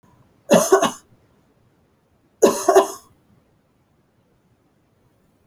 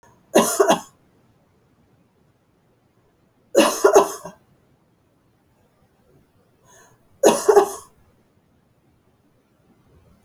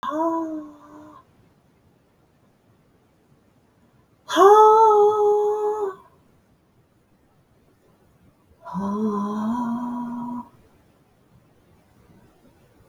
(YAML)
cough_length: 5.5 s
cough_amplitude: 27814
cough_signal_mean_std_ratio: 0.28
three_cough_length: 10.2 s
three_cough_amplitude: 32108
three_cough_signal_mean_std_ratio: 0.27
exhalation_length: 12.9 s
exhalation_amplitude: 25682
exhalation_signal_mean_std_ratio: 0.4
survey_phase: alpha (2021-03-01 to 2021-08-12)
age: 65+
gender: Female
wearing_mask: 'No'
symptom_none: true
symptom_onset: 6 days
smoker_status: Ex-smoker
respiratory_condition_asthma: false
respiratory_condition_other: false
recruitment_source: REACT
submission_delay: 3 days
covid_test_result: Negative
covid_test_method: RT-qPCR